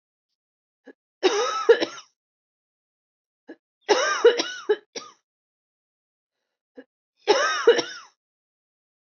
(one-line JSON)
{"three_cough_length": "9.1 s", "three_cough_amplitude": 19183, "three_cough_signal_mean_std_ratio": 0.32, "survey_phase": "beta (2021-08-13 to 2022-03-07)", "age": "18-44", "gender": "Female", "wearing_mask": "No", "symptom_cough_any": true, "symptom_runny_or_blocked_nose": true, "symptom_sore_throat": true, "symptom_fatigue": true, "symptom_headache": true, "symptom_loss_of_taste": true, "smoker_status": "Never smoked", "respiratory_condition_asthma": false, "respiratory_condition_other": false, "recruitment_source": "Test and Trace", "submission_delay": "2 days", "covid_test_result": "Positive", "covid_test_method": "RT-qPCR"}